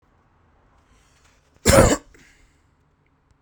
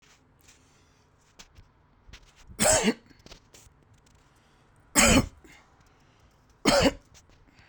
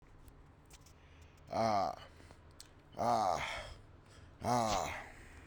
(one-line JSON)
{"cough_length": "3.4 s", "cough_amplitude": 32767, "cough_signal_mean_std_ratio": 0.24, "three_cough_length": "7.7 s", "three_cough_amplitude": 18636, "three_cough_signal_mean_std_ratio": 0.3, "exhalation_length": "5.5 s", "exhalation_amplitude": 3181, "exhalation_signal_mean_std_ratio": 0.54, "survey_phase": "beta (2021-08-13 to 2022-03-07)", "age": "45-64", "gender": "Male", "wearing_mask": "No", "symptom_none": true, "smoker_status": "Never smoked", "respiratory_condition_asthma": false, "respiratory_condition_other": false, "recruitment_source": "REACT", "submission_delay": "2 days", "covid_test_result": "Negative", "covid_test_method": "RT-qPCR"}